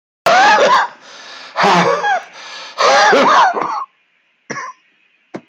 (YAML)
exhalation_length: 5.5 s
exhalation_amplitude: 29430
exhalation_signal_mean_std_ratio: 0.62
survey_phase: beta (2021-08-13 to 2022-03-07)
age: 45-64
gender: Male
wearing_mask: 'No'
symptom_cough_any: true
symptom_runny_or_blocked_nose: true
symptom_shortness_of_breath: true
symptom_sore_throat: true
symptom_fatigue: true
symptom_fever_high_temperature: true
symptom_headache: true
smoker_status: Never smoked
respiratory_condition_asthma: false
respiratory_condition_other: false
recruitment_source: Test and Trace
submission_delay: 1 day
covid_test_result: Positive
covid_test_method: RT-qPCR